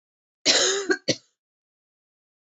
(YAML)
cough_length: 2.5 s
cough_amplitude: 22348
cough_signal_mean_std_ratio: 0.36
survey_phase: beta (2021-08-13 to 2022-03-07)
age: 18-44
gender: Female
wearing_mask: 'No'
symptom_cough_any: true
symptom_sore_throat: true
smoker_status: Never smoked
respiratory_condition_asthma: false
respiratory_condition_other: false
recruitment_source: Test and Trace
submission_delay: 2 days
covid_test_result: Positive
covid_test_method: ePCR